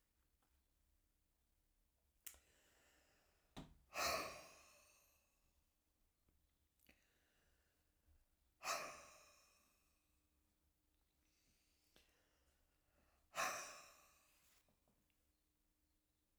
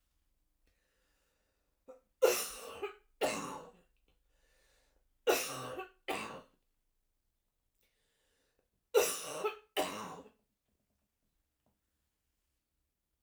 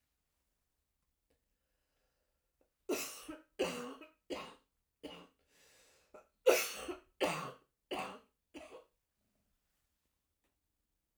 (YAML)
exhalation_length: 16.4 s
exhalation_amplitude: 1032
exhalation_signal_mean_std_ratio: 0.26
three_cough_length: 13.2 s
three_cough_amplitude: 5728
three_cough_signal_mean_std_ratio: 0.3
cough_length: 11.2 s
cough_amplitude: 6872
cough_signal_mean_std_ratio: 0.28
survey_phase: alpha (2021-03-01 to 2021-08-12)
age: 65+
gender: Female
wearing_mask: 'No'
symptom_cough_any: true
symptom_fatigue: true
symptom_fever_high_temperature: true
symptom_headache: true
symptom_onset: 6 days
smoker_status: Never smoked
respiratory_condition_asthma: false
respiratory_condition_other: false
recruitment_source: Test and Trace
submission_delay: 2 days
covid_test_result: Positive
covid_test_method: RT-qPCR
covid_ct_value: 16.2
covid_ct_gene: N gene
covid_ct_mean: 16.5
covid_viral_load: 3700000 copies/ml
covid_viral_load_category: High viral load (>1M copies/ml)